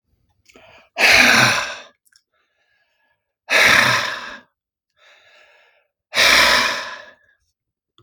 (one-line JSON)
{"exhalation_length": "8.0 s", "exhalation_amplitude": 32766, "exhalation_signal_mean_std_ratio": 0.42, "survey_phase": "beta (2021-08-13 to 2022-03-07)", "age": "45-64", "gender": "Male", "wearing_mask": "No", "symptom_none": true, "smoker_status": "Ex-smoker", "respiratory_condition_asthma": false, "respiratory_condition_other": false, "recruitment_source": "REACT", "submission_delay": "1 day", "covid_test_result": "Negative", "covid_test_method": "RT-qPCR"}